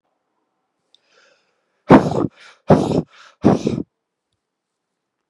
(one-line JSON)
{"exhalation_length": "5.3 s", "exhalation_amplitude": 32768, "exhalation_signal_mean_std_ratio": 0.29, "survey_phase": "beta (2021-08-13 to 2022-03-07)", "age": "18-44", "gender": "Male", "wearing_mask": "No", "symptom_cough_any": true, "symptom_runny_or_blocked_nose": true, "symptom_sore_throat": true, "symptom_headache": true, "symptom_change_to_sense_of_smell_or_taste": true, "smoker_status": "Ex-smoker", "respiratory_condition_asthma": false, "respiratory_condition_other": false, "recruitment_source": "Test and Trace", "submission_delay": "2 days", "covid_test_result": "Positive", "covid_test_method": "LFT"}